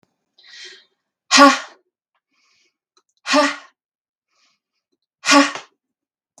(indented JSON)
{
  "exhalation_length": "6.4 s",
  "exhalation_amplitude": 32768,
  "exhalation_signal_mean_std_ratio": 0.27,
  "survey_phase": "beta (2021-08-13 to 2022-03-07)",
  "age": "18-44",
  "gender": "Female",
  "wearing_mask": "No",
  "symptom_none": true,
  "smoker_status": "Never smoked",
  "respiratory_condition_asthma": false,
  "respiratory_condition_other": false,
  "recruitment_source": "REACT",
  "submission_delay": "2 days",
  "covid_test_result": "Negative",
  "covid_test_method": "RT-qPCR"
}